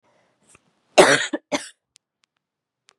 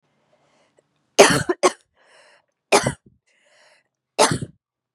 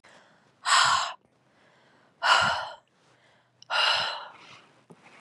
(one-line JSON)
{"cough_length": "3.0 s", "cough_amplitude": 32767, "cough_signal_mean_std_ratio": 0.25, "three_cough_length": "4.9 s", "three_cough_amplitude": 32768, "three_cough_signal_mean_std_ratio": 0.27, "exhalation_length": "5.2 s", "exhalation_amplitude": 15358, "exhalation_signal_mean_std_ratio": 0.43, "survey_phase": "beta (2021-08-13 to 2022-03-07)", "age": "18-44", "gender": "Female", "wearing_mask": "No", "symptom_cough_any": true, "symptom_runny_or_blocked_nose": true, "symptom_sore_throat": true, "symptom_fatigue": true, "symptom_headache": true, "symptom_change_to_sense_of_smell_or_taste": true, "symptom_loss_of_taste": true, "symptom_onset": "2 days", "smoker_status": "Never smoked", "respiratory_condition_asthma": false, "respiratory_condition_other": false, "recruitment_source": "Test and Trace", "submission_delay": "1 day", "covid_test_result": "Positive", "covid_test_method": "RT-qPCR", "covid_ct_value": 25.5, "covid_ct_gene": "ORF1ab gene"}